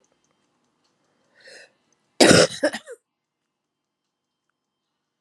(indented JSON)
{
  "cough_length": "5.2 s",
  "cough_amplitude": 32767,
  "cough_signal_mean_std_ratio": 0.21,
  "survey_phase": "alpha (2021-03-01 to 2021-08-12)",
  "age": "45-64",
  "gender": "Female",
  "wearing_mask": "No",
  "symptom_cough_any": true,
  "symptom_shortness_of_breath": true,
  "symptom_abdominal_pain": true,
  "symptom_fatigue": true,
  "symptom_fever_high_temperature": true,
  "symptom_headache": true,
  "symptom_change_to_sense_of_smell_or_taste": true,
  "symptom_onset": "3 days",
  "smoker_status": "Never smoked",
  "respiratory_condition_asthma": false,
  "respiratory_condition_other": false,
  "recruitment_source": "Test and Trace",
  "submission_delay": "2 days",
  "covid_test_result": "Positive",
  "covid_test_method": "RT-qPCR",
  "covid_ct_value": 16.6,
  "covid_ct_gene": "ORF1ab gene",
  "covid_ct_mean": 16.9,
  "covid_viral_load": "2900000 copies/ml",
  "covid_viral_load_category": "High viral load (>1M copies/ml)"
}